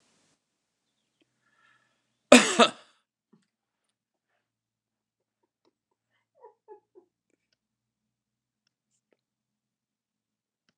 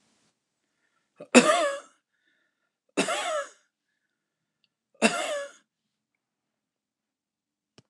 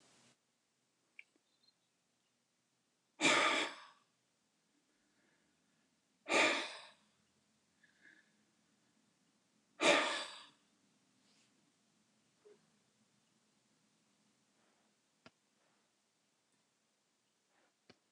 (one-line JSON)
{"cough_length": "10.8 s", "cough_amplitude": 29203, "cough_signal_mean_std_ratio": 0.11, "three_cough_length": "7.9 s", "three_cough_amplitude": 27692, "three_cough_signal_mean_std_ratio": 0.26, "exhalation_length": "18.1 s", "exhalation_amplitude": 5270, "exhalation_signal_mean_std_ratio": 0.22, "survey_phase": "beta (2021-08-13 to 2022-03-07)", "age": "65+", "gender": "Male", "wearing_mask": "No", "symptom_none": true, "smoker_status": "Never smoked", "respiratory_condition_asthma": false, "respiratory_condition_other": false, "recruitment_source": "REACT", "submission_delay": "3 days", "covid_test_result": "Negative", "covid_test_method": "RT-qPCR", "influenza_a_test_result": "Negative", "influenza_b_test_result": "Negative"}